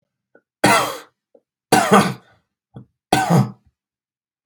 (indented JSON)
{
  "three_cough_length": "4.5 s",
  "three_cough_amplitude": 32768,
  "three_cough_signal_mean_std_ratio": 0.38,
  "survey_phase": "beta (2021-08-13 to 2022-03-07)",
  "age": "18-44",
  "gender": "Male",
  "wearing_mask": "No",
  "symptom_none": true,
  "smoker_status": "Never smoked",
  "respiratory_condition_asthma": false,
  "respiratory_condition_other": false,
  "recruitment_source": "REACT",
  "submission_delay": "0 days",
  "covid_test_result": "Negative",
  "covid_test_method": "RT-qPCR",
  "influenza_a_test_result": "Negative",
  "influenza_b_test_result": "Negative"
}